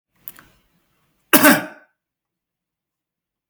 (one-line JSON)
{"cough_length": "3.5 s", "cough_amplitude": 32768, "cough_signal_mean_std_ratio": 0.23, "survey_phase": "beta (2021-08-13 to 2022-03-07)", "age": "18-44", "gender": "Male", "wearing_mask": "No", "symptom_none": true, "symptom_onset": "7 days", "smoker_status": "Ex-smoker", "respiratory_condition_asthma": true, "respiratory_condition_other": false, "recruitment_source": "REACT", "submission_delay": "2 days", "covid_test_result": "Negative", "covid_test_method": "RT-qPCR", "influenza_a_test_result": "Negative", "influenza_b_test_result": "Negative"}